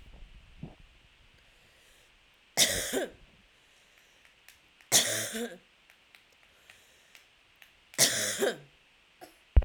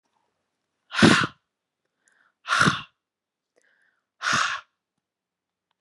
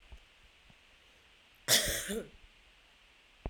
{"three_cough_length": "9.6 s", "three_cough_amplitude": 14219, "three_cough_signal_mean_std_ratio": 0.3, "exhalation_length": "5.8 s", "exhalation_amplitude": 31511, "exhalation_signal_mean_std_ratio": 0.29, "cough_length": "3.5 s", "cough_amplitude": 10740, "cough_signal_mean_std_ratio": 0.33, "survey_phase": "beta (2021-08-13 to 2022-03-07)", "age": "18-44", "gender": "Female", "wearing_mask": "No", "symptom_cough_any": true, "symptom_runny_or_blocked_nose": true, "symptom_sore_throat": true, "symptom_onset": "4 days", "smoker_status": "Never smoked", "respiratory_condition_asthma": false, "respiratory_condition_other": false, "recruitment_source": "Test and Trace", "submission_delay": "1 day", "covid_test_result": "Negative", "covid_test_method": "RT-qPCR"}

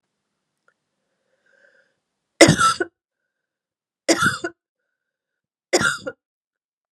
{"three_cough_length": "6.9 s", "three_cough_amplitude": 32768, "three_cough_signal_mean_std_ratio": 0.26, "survey_phase": "beta (2021-08-13 to 2022-03-07)", "age": "18-44", "gender": "Female", "wearing_mask": "No", "symptom_cough_any": true, "symptom_runny_or_blocked_nose": true, "symptom_fatigue": true, "symptom_headache": true, "symptom_change_to_sense_of_smell_or_taste": true, "symptom_loss_of_taste": true, "symptom_onset": "3 days", "smoker_status": "Never smoked", "respiratory_condition_asthma": false, "respiratory_condition_other": false, "recruitment_source": "Test and Trace", "submission_delay": "2 days", "covid_test_result": "Positive", "covid_test_method": "RT-qPCR", "covid_ct_value": 18.0, "covid_ct_gene": "N gene", "covid_ct_mean": 19.6, "covid_viral_load": "370000 copies/ml", "covid_viral_load_category": "Low viral load (10K-1M copies/ml)"}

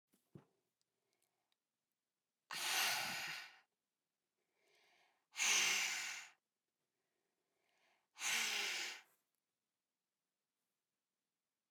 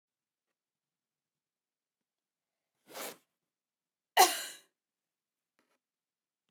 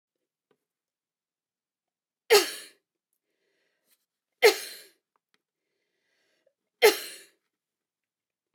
{"exhalation_length": "11.7 s", "exhalation_amplitude": 2447, "exhalation_signal_mean_std_ratio": 0.37, "cough_length": "6.5 s", "cough_amplitude": 11078, "cough_signal_mean_std_ratio": 0.14, "three_cough_length": "8.5 s", "three_cough_amplitude": 17658, "three_cough_signal_mean_std_ratio": 0.18, "survey_phase": "beta (2021-08-13 to 2022-03-07)", "age": "45-64", "gender": "Female", "wearing_mask": "No", "symptom_none": true, "smoker_status": "Never smoked", "respiratory_condition_asthma": false, "respiratory_condition_other": false, "recruitment_source": "REACT", "submission_delay": "2 days", "covid_test_result": "Negative", "covid_test_method": "RT-qPCR"}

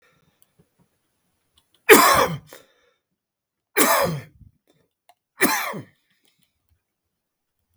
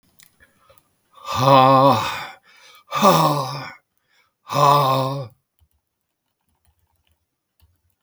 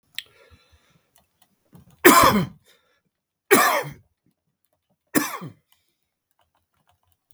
{"three_cough_length": "7.8 s", "three_cough_amplitude": 32768, "three_cough_signal_mean_std_ratio": 0.28, "exhalation_length": "8.0 s", "exhalation_amplitude": 32766, "exhalation_signal_mean_std_ratio": 0.41, "cough_length": "7.3 s", "cough_amplitude": 32768, "cough_signal_mean_std_ratio": 0.27, "survey_phase": "beta (2021-08-13 to 2022-03-07)", "age": "65+", "gender": "Male", "wearing_mask": "No", "symptom_none": true, "smoker_status": "Ex-smoker", "respiratory_condition_asthma": false, "respiratory_condition_other": false, "recruitment_source": "REACT", "submission_delay": "1 day", "covid_test_result": "Negative", "covid_test_method": "RT-qPCR", "influenza_a_test_result": "Unknown/Void", "influenza_b_test_result": "Unknown/Void"}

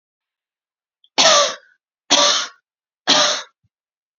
{"three_cough_length": "4.2 s", "three_cough_amplitude": 32493, "three_cough_signal_mean_std_ratio": 0.4, "survey_phase": "beta (2021-08-13 to 2022-03-07)", "age": "18-44", "gender": "Female", "wearing_mask": "No", "symptom_sore_throat": true, "symptom_onset": "3 days", "smoker_status": "Ex-smoker", "respiratory_condition_asthma": false, "respiratory_condition_other": false, "recruitment_source": "Test and Trace", "submission_delay": "2 days", "covid_test_result": "Negative", "covid_test_method": "RT-qPCR"}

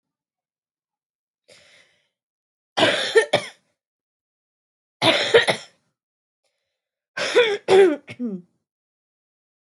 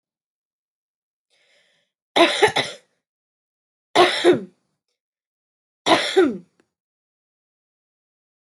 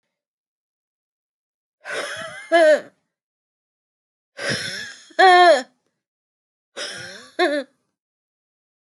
{"cough_length": "9.6 s", "cough_amplitude": 24339, "cough_signal_mean_std_ratio": 0.32, "three_cough_length": "8.4 s", "three_cough_amplitude": 24982, "three_cough_signal_mean_std_ratio": 0.29, "exhalation_length": "8.9 s", "exhalation_amplitude": 21506, "exhalation_signal_mean_std_ratio": 0.33, "survey_phase": "alpha (2021-03-01 to 2021-08-12)", "age": "18-44", "gender": "Female", "wearing_mask": "No", "symptom_cough_any": true, "symptom_shortness_of_breath": true, "symptom_abdominal_pain": true, "symptom_diarrhoea": true, "symptom_fatigue": true, "symptom_headache": true, "smoker_status": "Current smoker (1 to 10 cigarettes per day)", "respiratory_condition_asthma": false, "respiratory_condition_other": false, "recruitment_source": "REACT", "submission_delay": "1 day", "covid_test_result": "Negative", "covid_test_method": "RT-qPCR"}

